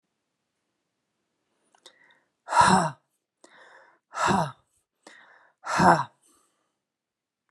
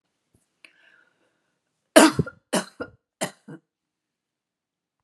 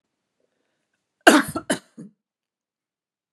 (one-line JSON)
{"exhalation_length": "7.5 s", "exhalation_amplitude": 22533, "exhalation_signal_mean_std_ratio": 0.29, "three_cough_length": "5.0 s", "three_cough_amplitude": 32767, "three_cough_signal_mean_std_ratio": 0.19, "cough_length": "3.3 s", "cough_amplitude": 32768, "cough_signal_mean_std_ratio": 0.2, "survey_phase": "beta (2021-08-13 to 2022-03-07)", "age": "45-64", "gender": "Female", "wearing_mask": "No", "symptom_none": true, "smoker_status": "Ex-smoker", "respiratory_condition_asthma": false, "respiratory_condition_other": false, "recruitment_source": "Test and Trace", "submission_delay": "1 day", "covid_test_result": "Negative", "covid_test_method": "RT-qPCR"}